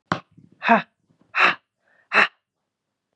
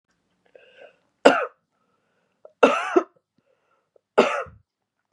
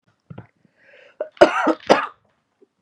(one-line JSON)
{"exhalation_length": "3.2 s", "exhalation_amplitude": 28223, "exhalation_signal_mean_std_ratio": 0.31, "three_cough_length": "5.1 s", "three_cough_amplitude": 32768, "three_cough_signal_mean_std_ratio": 0.26, "cough_length": "2.8 s", "cough_amplitude": 32768, "cough_signal_mean_std_ratio": 0.29, "survey_phase": "beta (2021-08-13 to 2022-03-07)", "age": "18-44", "gender": "Female", "wearing_mask": "No", "symptom_cough_any": true, "symptom_runny_or_blocked_nose": true, "symptom_sore_throat": true, "smoker_status": "Never smoked", "respiratory_condition_asthma": false, "respiratory_condition_other": false, "recruitment_source": "Test and Trace", "submission_delay": "2 days", "covid_test_result": "Positive", "covid_test_method": "RT-qPCR"}